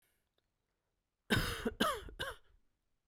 {"cough_length": "3.1 s", "cough_amplitude": 4392, "cough_signal_mean_std_ratio": 0.39, "survey_phase": "beta (2021-08-13 to 2022-03-07)", "age": "45-64", "gender": "Male", "wearing_mask": "No", "symptom_none": true, "smoker_status": "Never smoked", "respiratory_condition_asthma": false, "respiratory_condition_other": false, "recruitment_source": "REACT", "submission_delay": "0 days", "covid_test_result": "Negative", "covid_test_method": "RT-qPCR"}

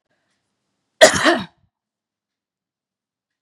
{"cough_length": "3.4 s", "cough_amplitude": 32768, "cough_signal_mean_std_ratio": 0.22, "survey_phase": "beta (2021-08-13 to 2022-03-07)", "age": "45-64", "gender": "Female", "wearing_mask": "No", "symptom_none": true, "smoker_status": "Never smoked", "respiratory_condition_asthma": false, "respiratory_condition_other": false, "recruitment_source": "Test and Trace", "submission_delay": "2 days", "covid_test_result": "Positive", "covid_test_method": "RT-qPCR"}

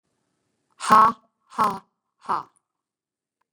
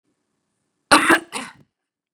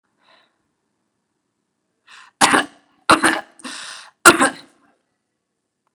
{"exhalation_length": "3.5 s", "exhalation_amplitude": 26559, "exhalation_signal_mean_std_ratio": 0.27, "cough_length": "2.1 s", "cough_amplitude": 32768, "cough_signal_mean_std_ratio": 0.28, "three_cough_length": "5.9 s", "three_cough_amplitude": 32768, "three_cough_signal_mean_std_ratio": 0.25, "survey_phase": "beta (2021-08-13 to 2022-03-07)", "age": "45-64", "gender": "Female", "wearing_mask": "No", "symptom_none": true, "smoker_status": "Ex-smoker", "respiratory_condition_asthma": false, "respiratory_condition_other": false, "recruitment_source": "REACT", "submission_delay": "1 day", "covid_test_result": "Negative", "covid_test_method": "RT-qPCR", "influenza_a_test_result": "Negative", "influenza_b_test_result": "Negative"}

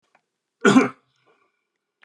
{"cough_length": "2.0 s", "cough_amplitude": 26907, "cough_signal_mean_std_ratio": 0.26, "survey_phase": "beta (2021-08-13 to 2022-03-07)", "age": "45-64", "gender": "Male", "wearing_mask": "No", "symptom_none": true, "smoker_status": "Ex-smoker", "respiratory_condition_asthma": false, "respiratory_condition_other": false, "recruitment_source": "REACT", "submission_delay": "3 days", "covid_test_result": "Negative", "covid_test_method": "RT-qPCR", "influenza_a_test_result": "Negative", "influenza_b_test_result": "Negative"}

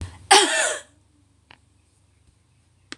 {"cough_length": "3.0 s", "cough_amplitude": 26028, "cough_signal_mean_std_ratio": 0.3, "survey_phase": "beta (2021-08-13 to 2022-03-07)", "age": "65+", "gender": "Female", "wearing_mask": "No", "symptom_none": true, "smoker_status": "Never smoked", "respiratory_condition_asthma": true, "respiratory_condition_other": false, "recruitment_source": "REACT", "submission_delay": "1 day", "covid_test_result": "Negative", "covid_test_method": "RT-qPCR", "influenza_a_test_result": "Negative", "influenza_b_test_result": "Negative"}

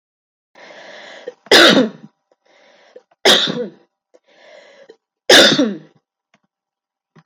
{"three_cough_length": "7.3 s", "three_cough_amplitude": 32768, "three_cough_signal_mean_std_ratio": 0.33, "survey_phase": "beta (2021-08-13 to 2022-03-07)", "age": "45-64", "gender": "Female", "wearing_mask": "No", "symptom_runny_or_blocked_nose": true, "symptom_onset": "12 days", "smoker_status": "Never smoked", "respiratory_condition_asthma": false, "respiratory_condition_other": false, "recruitment_source": "REACT", "submission_delay": "1 day", "covid_test_result": "Negative", "covid_test_method": "RT-qPCR"}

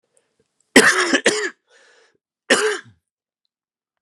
{"cough_length": "4.0 s", "cough_amplitude": 32768, "cough_signal_mean_std_ratio": 0.35, "survey_phase": "beta (2021-08-13 to 2022-03-07)", "age": "45-64", "gender": "Male", "wearing_mask": "Yes", "symptom_runny_or_blocked_nose": true, "symptom_sore_throat": true, "symptom_fever_high_temperature": true, "symptom_headache": true, "symptom_loss_of_taste": true, "symptom_other": true, "smoker_status": "Never smoked", "respiratory_condition_asthma": false, "respiratory_condition_other": false, "recruitment_source": "Test and Trace", "submission_delay": "2 days", "covid_test_result": "Positive", "covid_test_method": "RT-qPCR"}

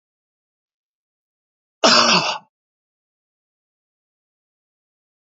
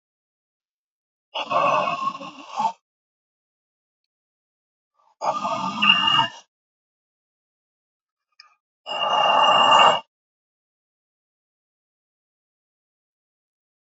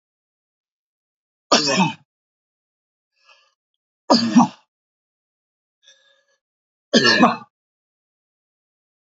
{"cough_length": "5.3 s", "cough_amplitude": 32767, "cough_signal_mean_std_ratio": 0.24, "exhalation_length": "14.0 s", "exhalation_amplitude": 26743, "exhalation_signal_mean_std_ratio": 0.35, "three_cough_length": "9.1 s", "three_cough_amplitude": 28441, "three_cough_signal_mean_std_ratio": 0.27, "survey_phase": "beta (2021-08-13 to 2022-03-07)", "age": "65+", "gender": "Male", "wearing_mask": "No", "symptom_none": true, "smoker_status": "Never smoked", "respiratory_condition_asthma": false, "respiratory_condition_other": false, "recruitment_source": "REACT", "submission_delay": "2 days", "covid_test_result": "Negative", "covid_test_method": "RT-qPCR"}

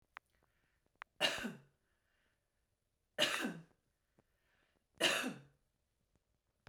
{"three_cough_length": "6.7 s", "three_cough_amplitude": 3447, "three_cough_signal_mean_std_ratio": 0.3, "survey_phase": "beta (2021-08-13 to 2022-03-07)", "age": "18-44", "gender": "Female", "wearing_mask": "No", "symptom_none": true, "smoker_status": "Current smoker (1 to 10 cigarettes per day)", "respiratory_condition_asthma": false, "respiratory_condition_other": false, "recruitment_source": "REACT", "submission_delay": "2 days", "covid_test_result": "Negative", "covid_test_method": "RT-qPCR"}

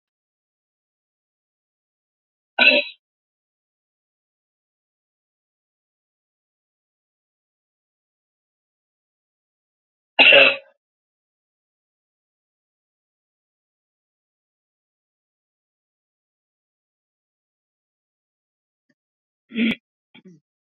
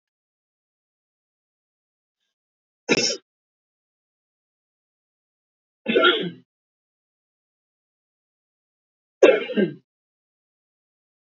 {"cough_length": "20.7 s", "cough_amplitude": 32484, "cough_signal_mean_std_ratio": 0.15, "three_cough_length": "11.3 s", "three_cough_amplitude": 27373, "three_cough_signal_mean_std_ratio": 0.21, "survey_phase": "beta (2021-08-13 to 2022-03-07)", "age": "65+", "gender": "Female", "wearing_mask": "No", "symptom_cough_any": true, "smoker_status": "Ex-smoker", "respiratory_condition_asthma": false, "respiratory_condition_other": false, "recruitment_source": "REACT", "submission_delay": "1 day", "covid_test_result": "Negative", "covid_test_method": "RT-qPCR", "influenza_a_test_result": "Unknown/Void", "influenza_b_test_result": "Unknown/Void"}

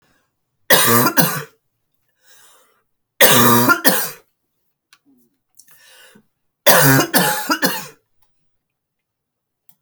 {"three_cough_length": "9.8 s", "three_cough_amplitude": 32768, "three_cough_signal_mean_std_ratio": 0.39, "survey_phase": "alpha (2021-03-01 to 2021-08-12)", "age": "45-64", "gender": "Female", "wearing_mask": "No", "symptom_cough_any": true, "symptom_change_to_sense_of_smell_or_taste": true, "symptom_loss_of_taste": true, "symptom_onset": "5 days", "smoker_status": "Never smoked", "respiratory_condition_asthma": true, "respiratory_condition_other": false, "recruitment_source": "Test and Trace", "submission_delay": "1 day", "covid_test_result": "Positive", "covid_test_method": "RT-qPCR"}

